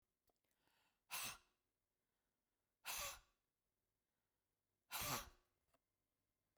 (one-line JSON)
{"exhalation_length": "6.6 s", "exhalation_amplitude": 764, "exhalation_signal_mean_std_ratio": 0.3, "survey_phase": "beta (2021-08-13 to 2022-03-07)", "age": "45-64", "gender": "Female", "wearing_mask": "No", "symptom_none": true, "smoker_status": "Ex-smoker", "respiratory_condition_asthma": false, "respiratory_condition_other": false, "recruitment_source": "REACT", "submission_delay": "2 days", "covid_test_result": "Negative", "covid_test_method": "RT-qPCR", "influenza_a_test_result": "Negative", "influenza_b_test_result": "Negative"}